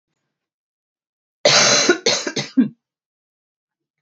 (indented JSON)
{
  "cough_length": "4.0 s",
  "cough_amplitude": 28270,
  "cough_signal_mean_std_ratio": 0.38,
  "survey_phase": "beta (2021-08-13 to 2022-03-07)",
  "age": "18-44",
  "gender": "Female",
  "wearing_mask": "No",
  "symptom_cough_any": true,
  "symptom_runny_or_blocked_nose": true,
  "symptom_sore_throat": true,
  "symptom_fatigue": true,
  "symptom_headache": true,
  "symptom_change_to_sense_of_smell_or_taste": true,
  "symptom_loss_of_taste": true,
  "symptom_onset": "4 days",
  "smoker_status": "Never smoked",
  "respiratory_condition_asthma": false,
  "respiratory_condition_other": false,
  "recruitment_source": "Test and Trace",
  "submission_delay": "2 days",
  "covid_test_result": "Positive",
  "covid_test_method": "RT-qPCR"
}